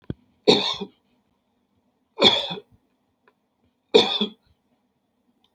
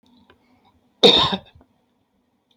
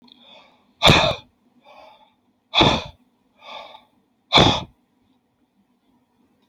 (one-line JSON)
{"three_cough_length": "5.5 s", "three_cough_amplitude": 28838, "three_cough_signal_mean_std_ratio": 0.29, "cough_length": "2.6 s", "cough_amplitude": 28960, "cough_signal_mean_std_ratio": 0.27, "exhalation_length": "6.5 s", "exhalation_amplitude": 30149, "exhalation_signal_mean_std_ratio": 0.29, "survey_phase": "beta (2021-08-13 to 2022-03-07)", "age": "45-64", "gender": "Male", "wearing_mask": "No", "symptom_none": true, "smoker_status": "Ex-smoker", "respiratory_condition_asthma": true, "respiratory_condition_other": false, "recruitment_source": "REACT", "submission_delay": "1 day", "covid_test_result": "Negative", "covid_test_method": "RT-qPCR"}